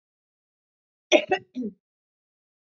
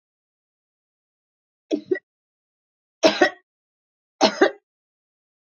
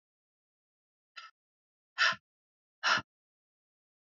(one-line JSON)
{"cough_length": "2.6 s", "cough_amplitude": 21962, "cough_signal_mean_std_ratio": 0.23, "three_cough_length": "5.5 s", "three_cough_amplitude": 25346, "three_cough_signal_mean_std_ratio": 0.23, "exhalation_length": "4.1 s", "exhalation_amplitude": 6219, "exhalation_signal_mean_std_ratio": 0.22, "survey_phase": "beta (2021-08-13 to 2022-03-07)", "age": "45-64", "gender": "Female", "wearing_mask": "No", "symptom_cough_any": true, "symptom_runny_or_blocked_nose": true, "symptom_fatigue": true, "symptom_change_to_sense_of_smell_or_taste": true, "symptom_other": true, "symptom_onset": "3 days", "smoker_status": "Never smoked", "respiratory_condition_asthma": false, "respiratory_condition_other": false, "recruitment_source": "Test and Trace", "submission_delay": "1 day", "covid_test_result": "Positive", "covid_test_method": "RT-qPCR", "covid_ct_value": 19.4, "covid_ct_gene": "N gene"}